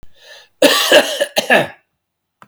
{"cough_length": "2.5 s", "cough_amplitude": 32768, "cough_signal_mean_std_ratio": 0.47, "survey_phase": "beta (2021-08-13 to 2022-03-07)", "age": "65+", "gender": "Male", "wearing_mask": "No", "symptom_cough_any": true, "symptom_new_continuous_cough": true, "symptom_runny_or_blocked_nose": true, "symptom_onset": "4 days", "smoker_status": "Never smoked", "respiratory_condition_asthma": false, "respiratory_condition_other": false, "recruitment_source": "Test and Trace", "submission_delay": "1 day", "covid_test_result": "Negative", "covid_test_method": "ePCR"}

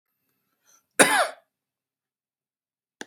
{"cough_length": "3.1 s", "cough_amplitude": 32768, "cough_signal_mean_std_ratio": 0.22, "survey_phase": "beta (2021-08-13 to 2022-03-07)", "age": "45-64", "gender": "Male", "wearing_mask": "No", "symptom_fatigue": true, "symptom_headache": true, "symptom_change_to_sense_of_smell_or_taste": true, "symptom_onset": "6 days", "smoker_status": "Never smoked", "respiratory_condition_asthma": false, "respiratory_condition_other": false, "recruitment_source": "Test and Trace", "submission_delay": "2 days", "covid_test_result": "Positive", "covid_test_method": "RT-qPCR"}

